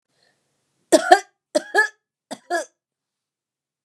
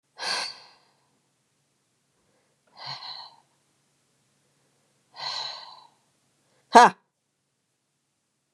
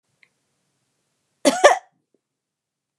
{"three_cough_length": "3.8 s", "three_cough_amplitude": 32768, "three_cough_signal_mean_std_ratio": 0.25, "exhalation_length": "8.5 s", "exhalation_amplitude": 32767, "exhalation_signal_mean_std_ratio": 0.17, "cough_length": "3.0 s", "cough_amplitude": 32723, "cough_signal_mean_std_ratio": 0.21, "survey_phase": "beta (2021-08-13 to 2022-03-07)", "age": "45-64", "gender": "Female", "wearing_mask": "No", "symptom_none": true, "smoker_status": "Never smoked", "respiratory_condition_asthma": false, "respiratory_condition_other": false, "recruitment_source": "REACT", "submission_delay": "3 days", "covid_test_result": "Negative", "covid_test_method": "RT-qPCR", "influenza_a_test_result": "Negative", "influenza_b_test_result": "Negative"}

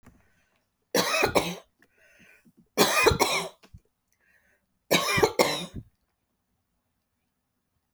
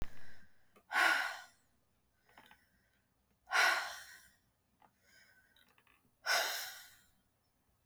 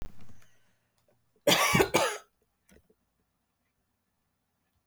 {"three_cough_length": "7.9 s", "three_cough_amplitude": 22230, "three_cough_signal_mean_std_ratio": 0.37, "exhalation_length": "7.9 s", "exhalation_amplitude": 4306, "exhalation_signal_mean_std_ratio": 0.38, "cough_length": "4.9 s", "cough_amplitude": 11490, "cough_signal_mean_std_ratio": 0.33, "survey_phase": "beta (2021-08-13 to 2022-03-07)", "age": "45-64", "gender": "Female", "wearing_mask": "No", "symptom_cough_any": true, "symptom_runny_or_blocked_nose": true, "symptom_shortness_of_breath": true, "symptom_sore_throat": true, "symptom_fatigue": true, "symptom_headache": true, "symptom_loss_of_taste": true, "symptom_onset": "12 days", "smoker_status": "Ex-smoker", "respiratory_condition_asthma": false, "respiratory_condition_other": false, "recruitment_source": "REACT", "submission_delay": "3 days", "covid_test_result": "Negative", "covid_test_method": "RT-qPCR", "influenza_a_test_result": "Negative", "influenza_b_test_result": "Negative"}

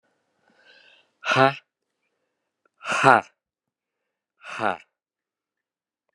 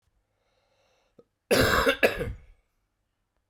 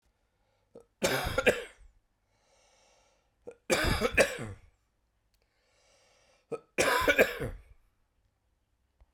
{"exhalation_length": "6.1 s", "exhalation_amplitude": 32767, "exhalation_signal_mean_std_ratio": 0.23, "cough_length": "3.5 s", "cough_amplitude": 13099, "cough_signal_mean_std_ratio": 0.35, "three_cough_length": "9.1 s", "three_cough_amplitude": 10947, "three_cough_signal_mean_std_ratio": 0.35, "survey_phase": "beta (2021-08-13 to 2022-03-07)", "age": "45-64", "gender": "Male", "wearing_mask": "No", "symptom_cough_any": true, "symptom_new_continuous_cough": true, "symptom_runny_or_blocked_nose": true, "symptom_sore_throat": true, "symptom_fatigue": true, "symptom_fever_high_temperature": true, "symptom_headache": true, "symptom_change_to_sense_of_smell_or_taste": true, "symptom_loss_of_taste": true, "symptom_onset": "2 days", "smoker_status": "Never smoked", "respiratory_condition_asthma": false, "respiratory_condition_other": false, "recruitment_source": "Test and Trace", "submission_delay": "1 day", "covid_test_result": "Positive", "covid_test_method": "RT-qPCR", "covid_ct_value": 14.5, "covid_ct_gene": "ORF1ab gene", "covid_ct_mean": 14.8, "covid_viral_load": "14000000 copies/ml", "covid_viral_load_category": "High viral load (>1M copies/ml)"}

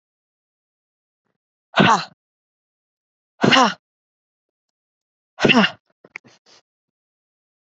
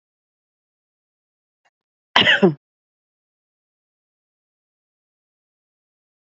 {"exhalation_length": "7.7 s", "exhalation_amplitude": 28766, "exhalation_signal_mean_std_ratio": 0.25, "cough_length": "6.2 s", "cough_amplitude": 28322, "cough_signal_mean_std_ratio": 0.18, "survey_phase": "beta (2021-08-13 to 2022-03-07)", "age": "45-64", "gender": "Female", "wearing_mask": "No", "symptom_none": true, "symptom_onset": "12 days", "smoker_status": "Ex-smoker", "respiratory_condition_asthma": false, "respiratory_condition_other": false, "recruitment_source": "REACT", "submission_delay": "1 day", "covid_test_result": "Negative", "covid_test_method": "RT-qPCR", "influenza_a_test_result": "Negative", "influenza_b_test_result": "Negative"}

